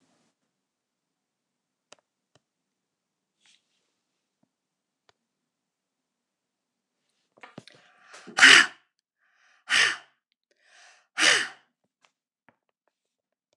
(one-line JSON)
{"exhalation_length": "13.6 s", "exhalation_amplitude": 29066, "exhalation_signal_mean_std_ratio": 0.17, "survey_phase": "beta (2021-08-13 to 2022-03-07)", "age": "65+", "gender": "Female", "wearing_mask": "No", "symptom_none": true, "smoker_status": "Never smoked", "respiratory_condition_asthma": true, "respiratory_condition_other": false, "recruitment_source": "REACT", "submission_delay": "3 days", "covid_test_result": "Negative", "covid_test_method": "RT-qPCR"}